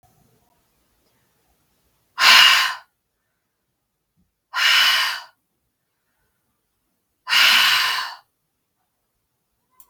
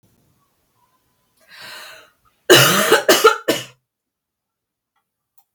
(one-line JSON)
{"exhalation_length": "9.9 s", "exhalation_amplitude": 32768, "exhalation_signal_mean_std_ratio": 0.35, "cough_length": "5.5 s", "cough_amplitude": 32768, "cough_signal_mean_std_ratio": 0.32, "survey_phase": "beta (2021-08-13 to 2022-03-07)", "age": "18-44", "gender": "Female", "wearing_mask": "No", "symptom_runny_or_blocked_nose": true, "symptom_sore_throat": true, "symptom_fatigue": true, "symptom_onset": "4 days", "smoker_status": "Never smoked", "respiratory_condition_asthma": false, "respiratory_condition_other": false, "recruitment_source": "REACT", "submission_delay": "1 day", "covid_test_result": "Positive", "covid_test_method": "RT-qPCR", "covid_ct_value": 29.0, "covid_ct_gene": "E gene"}